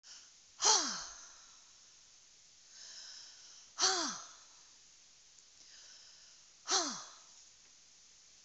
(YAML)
exhalation_length: 8.4 s
exhalation_amplitude: 6185
exhalation_signal_mean_std_ratio: 0.36
survey_phase: beta (2021-08-13 to 2022-03-07)
age: 65+
gender: Female
wearing_mask: 'No'
symptom_none: true
smoker_status: Never smoked
respiratory_condition_asthma: false
respiratory_condition_other: false
recruitment_source: REACT
submission_delay: 2 days
covid_test_result: Negative
covid_test_method: RT-qPCR
influenza_a_test_result: Negative
influenza_b_test_result: Negative